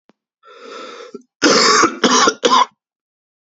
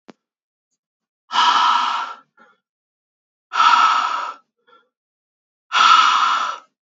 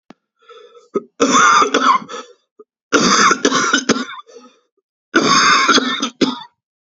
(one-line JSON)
{"cough_length": "3.6 s", "cough_amplitude": 32768, "cough_signal_mean_std_ratio": 0.48, "exhalation_length": "6.9 s", "exhalation_amplitude": 28005, "exhalation_signal_mean_std_ratio": 0.48, "three_cough_length": "6.9 s", "three_cough_amplitude": 32768, "three_cough_signal_mean_std_ratio": 0.56, "survey_phase": "beta (2021-08-13 to 2022-03-07)", "age": "18-44", "gender": "Male", "wearing_mask": "No", "symptom_cough_any": true, "symptom_new_continuous_cough": true, "symptom_runny_or_blocked_nose": true, "symptom_sore_throat": true, "symptom_fatigue": true, "symptom_fever_high_temperature": true, "symptom_headache": true, "symptom_other": true, "symptom_onset": "3 days", "smoker_status": "Never smoked", "respiratory_condition_asthma": false, "respiratory_condition_other": true, "recruitment_source": "Test and Trace", "submission_delay": "1 day", "covid_test_result": "Positive", "covid_test_method": "ePCR"}